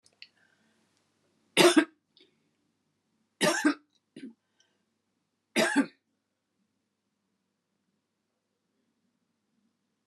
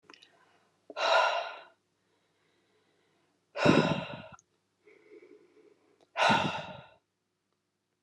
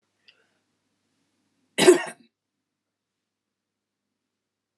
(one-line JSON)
{"three_cough_length": "10.1 s", "three_cough_amplitude": 16450, "three_cough_signal_mean_std_ratio": 0.22, "exhalation_length": "8.0 s", "exhalation_amplitude": 11616, "exhalation_signal_mean_std_ratio": 0.34, "cough_length": "4.8 s", "cough_amplitude": 26119, "cough_signal_mean_std_ratio": 0.16, "survey_phase": "alpha (2021-03-01 to 2021-08-12)", "age": "65+", "gender": "Female", "wearing_mask": "No", "symptom_none": true, "smoker_status": "Never smoked", "respiratory_condition_asthma": false, "respiratory_condition_other": false, "recruitment_source": "REACT", "submission_delay": "2 days", "covid_test_result": "Negative", "covid_test_method": "RT-qPCR"}